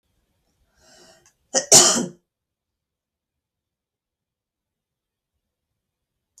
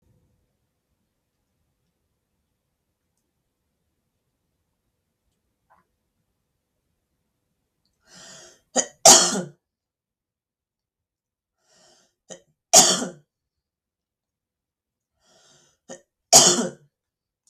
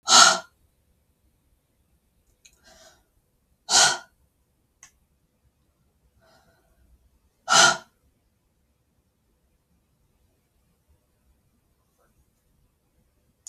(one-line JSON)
{"cough_length": "6.4 s", "cough_amplitude": 32768, "cough_signal_mean_std_ratio": 0.18, "three_cough_length": "17.5 s", "three_cough_amplitude": 32768, "three_cough_signal_mean_std_ratio": 0.18, "exhalation_length": "13.5 s", "exhalation_amplitude": 32615, "exhalation_signal_mean_std_ratio": 0.19, "survey_phase": "beta (2021-08-13 to 2022-03-07)", "age": "18-44", "gender": "Female", "wearing_mask": "No", "symptom_none": true, "smoker_status": "Never smoked", "respiratory_condition_asthma": false, "respiratory_condition_other": false, "recruitment_source": "REACT", "submission_delay": "3 days", "covid_test_result": "Negative", "covid_test_method": "RT-qPCR", "influenza_a_test_result": "Negative", "influenza_b_test_result": "Negative"}